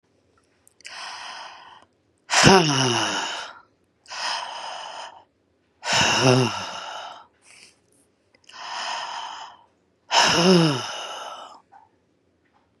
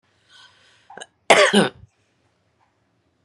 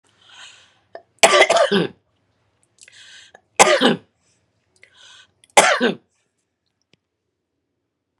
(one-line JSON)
{"exhalation_length": "12.8 s", "exhalation_amplitude": 32768, "exhalation_signal_mean_std_ratio": 0.43, "cough_length": "3.2 s", "cough_amplitude": 32690, "cough_signal_mean_std_ratio": 0.26, "three_cough_length": "8.2 s", "three_cough_amplitude": 32768, "three_cough_signal_mean_std_ratio": 0.31, "survey_phase": "beta (2021-08-13 to 2022-03-07)", "age": "45-64", "gender": "Female", "wearing_mask": "No", "symptom_none": true, "smoker_status": "Ex-smoker", "respiratory_condition_asthma": false, "respiratory_condition_other": false, "recruitment_source": "Test and Trace", "submission_delay": "2 days", "covid_test_result": "Positive", "covid_test_method": "RT-qPCR", "covid_ct_value": 20.2, "covid_ct_gene": "ORF1ab gene", "covid_ct_mean": 21.2, "covid_viral_load": "110000 copies/ml", "covid_viral_load_category": "Low viral load (10K-1M copies/ml)"}